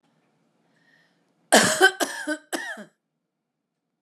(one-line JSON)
{"cough_length": "4.0 s", "cough_amplitude": 28560, "cough_signal_mean_std_ratio": 0.3, "survey_phase": "beta (2021-08-13 to 2022-03-07)", "age": "65+", "gender": "Female", "wearing_mask": "No", "symptom_none": true, "smoker_status": "Never smoked", "respiratory_condition_asthma": false, "respiratory_condition_other": false, "recruitment_source": "REACT", "submission_delay": "7 days", "covid_test_result": "Negative", "covid_test_method": "RT-qPCR", "influenza_a_test_result": "Unknown/Void", "influenza_b_test_result": "Unknown/Void"}